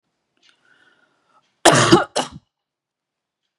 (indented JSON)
{
  "cough_length": "3.6 s",
  "cough_amplitude": 32768,
  "cough_signal_mean_std_ratio": 0.27,
  "survey_phase": "beta (2021-08-13 to 2022-03-07)",
  "age": "18-44",
  "gender": "Female",
  "wearing_mask": "No",
  "symptom_runny_or_blocked_nose": true,
  "symptom_shortness_of_breath": true,
  "symptom_headache": true,
  "symptom_loss_of_taste": true,
  "symptom_onset": "5 days",
  "smoker_status": "Never smoked",
  "respiratory_condition_asthma": false,
  "respiratory_condition_other": false,
  "recruitment_source": "Test and Trace",
  "submission_delay": "1 day",
  "covid_test_result": "Positive",
  "covid_test_method": "ePCR"
}